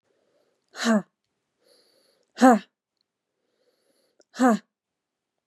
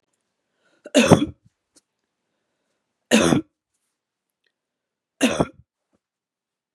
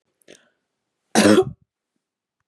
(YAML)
exhalation_length: 5.5 s
exhalation_amplitude: 26926
exhalation_signal_mean_std_ratio: 0.24
three_cough_length: 6.7 s
three_cough_amplitude: 32768
three_cough_signal_mean_std_ratio: 0.25
cough_length: 2.5 s
cough_amplitude: 28765
cough_signal_mean_std_ratio: 0.28
survey_phase: beta (2021-08-13 to 2022-03-07)
age: 18-44
gender: Female
wearing_mask: 'No'
symptom_fatigue: true
smoker_status: Never smoked
respiratory_condition_asthma: false
respiratory_condition_other: false
recruitment_source: Test and Trace
submission_delay: 2 days
covid_test_result: Positive
covid_test_method: RT-qPCR
covid_ct_value: 21.1
covid_ct_gene: ORF1ab gene
covid_ct_mean: 21.8
covid_viral_load: 69000 copies/ml
covid_viral_load_category: Low viral load (10K-1M copies/ml)